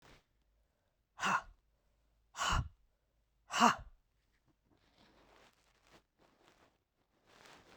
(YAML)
exhalation_length: 7.8 s
exhalation_amplitude: 7571
exhalation_signal_mean_std_ratio: 0.24
survey_phase: beta (2021-08-13 to 2022-03-07)
age: 45-64
gender: Female
wearing_mask: 'No'
symptom_cough_any: true
symptom_runny_or_blocked_nose: true
symptom_fatigue: true
symptom_change_to_sense_of_smell_or_taste: true
smoker_status: Ex-smoker
respiratory_condition_asthma: false
respiratory_condition_other: false
recruitment_source: Test and Trace
submission_delay: 2 days
covid_test_result: Positive
covid_test_method: RT-qPCR
covid_ct_value: 19.2
covid_ct_gene: ORF1ab gene
covid_ct_mean: 20.2
covid_viral_load: 240000 copies/ml
covid_viral_load_category: Low viral load (10K-1M copies/ml)